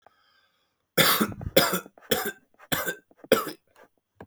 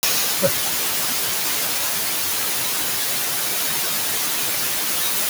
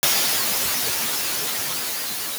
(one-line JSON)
{"three_cough_length": "4.3 s", "three_cough_amplitude": 21828, "three_cough_signal_mean_std_ratio": 0.38, "exhalation_length": "5.3 s", "exhalation_amplitude": 20878, "exhalation_signal_mean_std_ratio": 1.29, "cough_length": "2.4 s", "cough_amplitude": 16502, "cough_signal_mean_std_ratio": 1.17, "survey_phase": "beta (2021-08-13 to 2022-03-07)", "age": "18-44", "gender": "Male", "wearing_mask": "No", "symptom_sore_throat": true, "smoker_status": "Ex-smoker", "respiratory_condition_asthma": false, "respiratory_condition_other": false, "recruitment_source": "REACT", "submission_delay": "2 days", "covid_test_result": "Negative", "covid_test_method": "RT-qPCR"}